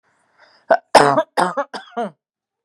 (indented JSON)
{
  "cough_length": "2.6 s",
  "cough_amplitude": 32768,
  "cough_signal_mean_std_ratio": 0.36,
  "survey_phase": "beta (2021-08-13 to 2022-03-07)",
  "age": "18-44",
  "gender": "Female",
  "wearing_mask": "No",
  "symptom_none": true,
  "smoker_status": "Ex-smoker",
  "respiratory_condition_asthma": false,
  "respiratory_condition_other": false,
  "recruitment_source": "REACT",
  "submission_delay": "8 days",
  "covid_test_result": "Negative",
  "covid_test_method": "RT-qPCR",
  "influenza_a_test_result": "Negative",
  "influenza_b_test_result": "Negative"
}